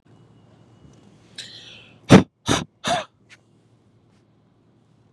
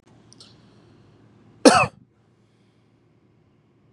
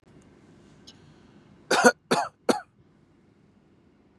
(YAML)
exhalation_length: 5.1 s
exhalation_amplitude: 32768
exhalation_signal_mean_std_ratio: 0.2
cough_length: 3.9 s
cough_amplitude: 32767
cough_signal_mean_std_ratio: 0.19
three_cough_length: 4.2 s
three_cough_amplitude: 29859
three_cough_signal_mean_std_ratio: 0.26
survey_phase: beta (2021-08-13 to 2022-03-07)
age: 18-44
gender: Male
wearing_mask: 'No'
symptom_none: true
smoker_status: Never smoked
respiratory_condition_asthma: false
respiratory_condition_other: false
recruitment_source: REACT
submission_delay: 2 days
covid_test_result: Negative
covid_test_method: RT-qPCR